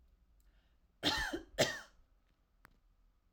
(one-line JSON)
{"cough_length": "3.3 s", "cough_amplitude": 5890, "cough_signal_mean_std_ratio": 0.33, "survey_phase": "alpha (2021-03-01 to 2021-08-12)", "age": "18-44", "gender": "Female", "wearing_mask": "No", "symptom_fatigue": true, "symptom_onset": "12 days", "smoker_status": "Never smoked", "respiratory_condition_asthma": true, "respiratory_condition_other": false, "recruitment_source": "REACT", "submission_delay": "1 day", "covid_test_result": "Negative", "covid_test_method": "RT-qPCR"}